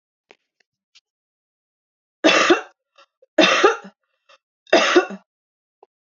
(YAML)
three_cough_length: 6.1 s
three_cough_amplitude: 27184
three_cough_signal_mean_std_ratio: 0.33
survey_phase: beta (2021-08-13 to 2022-03-07)
age: 18-44
gender: Female
wearing_mask: 'No'
symptom_change_to_sense_of_smell_or_taste: true
smoker_status: Current smoker (1 to 10 cigarettes per day)
respiratory_condition_asthma: false
respiratory_condition_other: false
recruitment_source: Test and Trace
submission_delay: 1 day
covid_test_result: Negative
covid_test_method: RT-qPCR